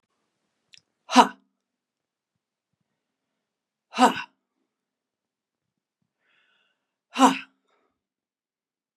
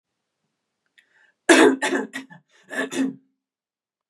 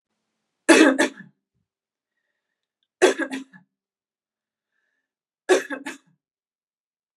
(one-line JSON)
{"exhalation_length": "9.0 s", "exhalation_amplitude": 32238, "exhalation_signal_mean_std_ratio": 0.17, "cough_length": "4.1 s", "cough_amplitude": 27828, "cough_signal_mean_std_ratio": 0.32, "three_cough_length": "7.2 s", "three_cough_amplitude": 32657, "three_cough_signal_mean_std_ratio": 0.25, "survey_phase": "beta (2021-08-13 to 2022-03-07)", "age": "45-64", "gender": "Female", "wearing_mask": "No", "symptom_fatigue": true, "symptom_headache": true, "symptom_onset": "12 days", "smoker_status": "Never smoked", "respiratory_condition_asthma": false, "respiratory_condition_other": false, "recruitment_source": "REACT", "submission_delay": "0 days", "covid_test_result": "Negative", "covid_test_method": "RT-qPCR", "influenza_a_test_result": "Negative", "influenza_b_test_result": "Negative"}